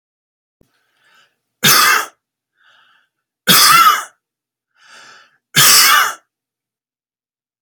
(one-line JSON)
{"three_cough_length": "7.6 s", "three_cough_amplitude": 32768, "three_cough_signal_mean_std_ratio": 0.37, "survey_phase": "beta (2021-08-13 to 2022-03-07)", "age": "45-64", "gender": "Male", "wearing_mask": "No", "symptom_none": true, "symptom_onset": "12 days", "smoker_status": "Never smoked", "respiratory_condition_asthma": false, "respiratory_condition_other": false, "recruitment_source": "REACT", "submission_delay": "1 day", "covid_test_result": "Negative", "covid_test_method": "RT-qPCR"}